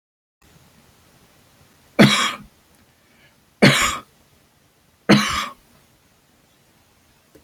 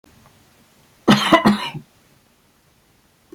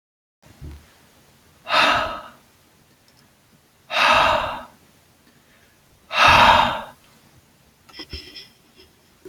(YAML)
three_cough_length: 7.4 s
three_cough_amplitude: 29851
three_cough_signal_mean_std_ratio: 0.28
cough_length: 3.3 s
cough_amplitude: 28370
cough_signal_mean_std_ratio: 0.31
exhalation_length: 9.3 s
exhalation_amplitude: 29658
exhalation_signal_mean_std_ratio: 0.36
survey_phase: beta (2021-08-13 to 2022-03-07)
age: 45-64
gender: Male
wearing_mask: 'No'
symptom_fatigue: true
smoker_status: Never smoked
respiratory_condition_asthma: false
respiratory_condition_other: false
recruitment_source: REACT
submission_delay: 2 days
covid_test_result: Negative
covid_test_method: RT-qPCR